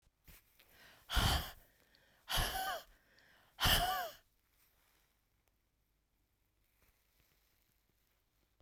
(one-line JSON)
{"exhalation_length": "8.6 s", "exhalation_amplitude": 4522, "exhalation_signal_mean_std_ratio": 0.32, "survey_phase": "beta (2021-08-13 to 2022-03-07)", "age": "65+", "gender": "Female", "wearing_mask": "No", "symptom_cough_any": true, "smoker_status": "Ex-smoker", "respiratory_condition_asthma": false, "respiratory_condition_other": true, "recruitment_source": "Test and Trace", "submission_delay": "1 day", "covid_test_result": "Positive", "covid_test_method": "RT-qPCR", "covid_ct_value": 16.8, "covid_ct_gene": "ORF1ab gene", "covid_ct_mean": 16.9, "covid_viral_load": "2900000 copies/ml", "covid_viral_load_category": "High viral load (>1M copies/ml)"}